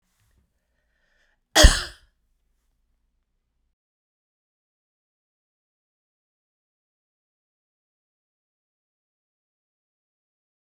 {"cough_length": "10.8 s", "cough_amplitude": 32767, "cough_signal_mean_std_ratio": 0.11, "survey_phase": "beta (2021-08-13 to 2022-03-07)", "age": "45-64", "gender": "Female", "wearing_mask": "No", "symptom_runny_or_blocked_nose": true, "symptom_onset": "9 days", "smoker_status": "Never smoked", "respiratory_condition_asthma": false, "respiratory_condition_other": false, "recruitment_source": "REACT", "submission_delay": "2 days", "covid_test_result": "Negative", "covid_test_method": "RT-qPCR"}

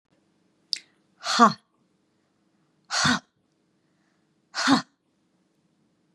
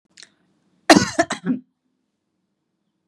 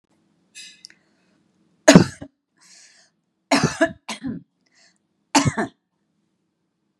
{"exhalation_length": "6.1 s", "exhalation_amplitude": 26575, "exhalation_signal_mean_std_ratio": 0.26, "cough_length": "3.1 s", "cough_amplitude": 32768, "cough_signal_mean_std_ratio": 0.24, "three_cough_length": "7.0 s", "three_cough_amplitude": 32768, "three_cough_signal_mean_std_ratio": 0.23, "survey_phase": "beta (2021-08-13 to 2022-03-07)", "age": "45-64", "gender": "Female", "wearing_mask": "No", "symptom_none": true, "smoker_status": "Never smoked", "respiratory_condition_asthma": false, "respiratory_condition_other": false, "recruitment_source": "REACT", "submission_delay": "4 days", "covid_test_result": "Negative", "covid_test_method": "RT-qPCR", "influenza_a_test_result": "Negative", "influenza_b_test_result": "Negative"}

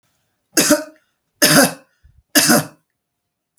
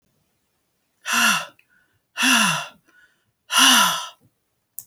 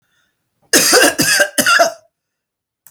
{"three_cough_length": "3.6 s", "three_cough_amplitude": 32768, "three_cough_signal_mean_std_ratio": 0.38, "exhalation_length": "4.9 s", "exhalation_amplitude": 28644, "exhalation_signal_mean_std_ratio": 0.42, "cough_length": "2.9 s", "cough_amplitude": 32768, "cough_signal_mean_std_ratio": 0.5, "survey_phase": "alpha (2021-03-01 to 2021-08-12)", "age": "45-64", "gender": "Female", "wearing_mask": "No", "symptom_none": true, "smoker_status": "Ex-smoker", "respiratory_condition_asthma": false, "respiratory_condition_other": false, "recruitment_source": "REACT", "submission_delay": "2 days", "covid_test_result": "Negative", "covid_test_method": "RT-qPCR"}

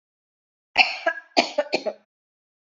{"cough_length": "2.6 s", "cough_amplitude": 26961, "cough_signal_mean_std_ratio": 0.33, "survey_phase": "beta (2021-08-13 to 2022-03-07)", "age": "18-44", "gender": "Female", "wearing_mask": "No", "symptom_runny_or_blocked_nose": true, "smoker_status": "Never smoked", "respiratory_condition_asthma": false, "respiratory_condition_other": false, "recruitment_source": "REACT", "submission_delay": "3 days", "covid_test_result": "Negative", "covid_test_method": "RT-qPCR"}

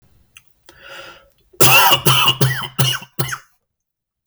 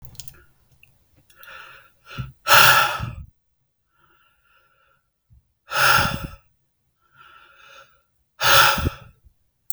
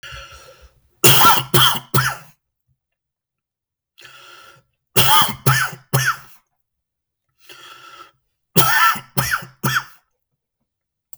{"cough_length": "4.3 s", "cough_amplitude": 32768, "cough_signal_mean_std_ratio": 0.45, "exhalation_length": "9.7 s", "exhalation_amplitude": 32768, "exhalation_signal_mean_std_ratio": 0.32, "three_cough_length": "11.2 s", "three_cough_amplitude": 32768, "three_cough_signal_mean_std_ratio": 0.39, "survey_phase": "beta (2021-08-13 to 2022-03-07)", "age": "18-44", "gender": "Male", "wearing_mask": "No", "symptom_none": true, "smoker_status": "Never smoked", "respiratory_condition_asthma": true, "respiratory_condition_other": false, "recruitment_source": "REACT", "submission_delay": "3 days", "covid_test_result": "Negative", "covid_test_method": "RT-qPCR", "influenza_a_test_result": "Negative", "influenza_b_test_result": "Negative"}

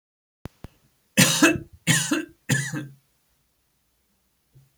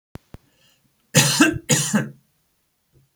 {"three_cough_length": "4.8 s", "three_cough_amplitude": 29252, "three_cough_signal_mean_std_ratio": 0.35, "cough_length": "3.2 s", "cough_amplitude": 31150, "cough_signal_mean_std_ratio": 0.38, "survey_phase": "alpha (2021-03-01 to 2021-08-12)", "age": "45-64", "gender": "Male", "wearing_mask": "No", "symptom_none": true, "smoker_status": "Never smoked", "respiratory_condition_asthma": false, "respiratory_condition_other": false, "recruitment_source": "REACT", "submission_delay": "1 day", "covid_test_result": "Negative", "covid_test_method": "RT-qPCR"}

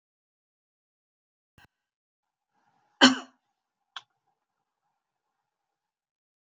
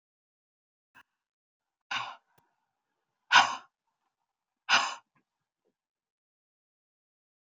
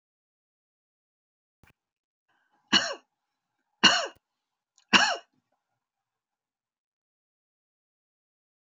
{"cough_length": "6.5 s", "cough_amplitude": 25758, "cough_signal_mean_std_ratio": 0.11, "exhalation_length": "7.4 s", "exhalation_amplitude": 16988, "exhalation_signal_mean_std_ratio": 0.19, "three_cough_length": "8.6 s", "three_cough_amplitude": 25884, "three_cough_signal_mean_std_ratio": 0.19, "survey_phase": "beta (2021-08-13 to 2022-03-07)", "age": "65+", "gender": "Female", "wearing_mask": "No", "symptom_sore_throat": true, "smoker_status": "Ex-smoker", "respiratory_condition_asthma": false, "respiratory_condition_other": false, "recruitment_source": "REACT", "submission_delay": "2 days", "covid_test_result": "Negative", "covid_test_method": "RT-qPCR"}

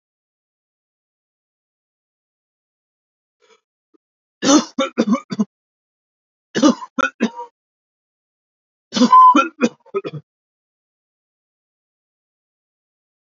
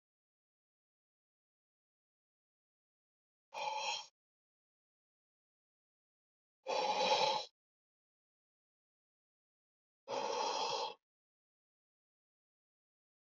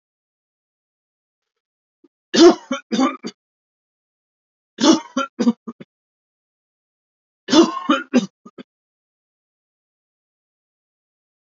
{"cough_length": "13.4 s", "cough_amplitude": 30029, "cough_signal_mean_std_ratio": 0.26, "exhalation_length": "13.2 s", "exhalation_amplitude": 3478, "exhalation_signal_mean_std_ratio": 0.31, "three_cough_length": "11.4 s", "three_cough_amplitude": 32768, "three_cough_signal_mean_std_ratio": 0.26, "survey_phase": "alpha (2021-03-01 to 2021-08-12)", "age": "18-44", "gender": "Male", "wearing_mask": "No", "symptom_fatigue": true, "smoker_status": "Ex-smoker", "respiratory_condition_asthma": false, "respiratory_condition_other": false, "recruitment_source": "REACT", "submission_delay": "1 day", "covid_test_result": "Negative", "covid_test_method": "RT-qPCR"}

